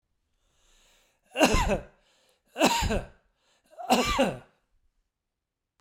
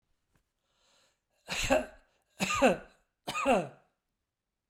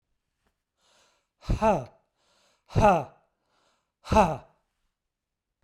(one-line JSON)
{"three_cough_length": "5.8 s", "three_cough_amplitude": 18809, "three_cough_signal_mean_std_ratio": 0.39, "cough_length": "4.7 s", "cough_amplitude": 8113, "cough_signal_mean_std_ratio": 0.37, "exhalation_length": "5.6 s", "exhalation_amplitude": 15848, "exhalation_signal_mean_std_ratio": 0.3, "survey_phase": "beta (2021-08-13 to 2022-03-07)", "age": "65+", "gender": "Male", "wearing_mask": "No", "symptom_none": true, "smoker_status": "Ex-smoker", "respiratory_condition_asthma": false, "respiratory_condition_other": false, "recruitment_source": "REACT", "submission_delay": "6 days", "covid_test_result": "Negative", "covid_test_method": "RT-qPCR"}